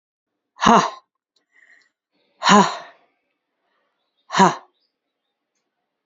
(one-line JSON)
{"exhalation_length": "6.1 s", "exhalation_amplitude": 28188, "exhalation_signal_mean_std_ratio": 0.26, "survey_phase": "beta (2021-08-13 to 2022-03-07)", "age": "45-64", "gender": "Female", "wearing_mask": "No", "symptom_cough_any": true, "symptom_runny_or_blocked_nose": true, "symptom_shortness_of_breath": true, "symptom_sore_throat": true, "symptom_headache": true, "smoker_status": "Never smoked", "respiratory_condition_asthma": false, "respiratory_condition_other": false, "recruitment_source": "Test and Trace", "submission_delay": "2 days", "covid_test_result": "Positive", "covid_test_method": "LAMP"}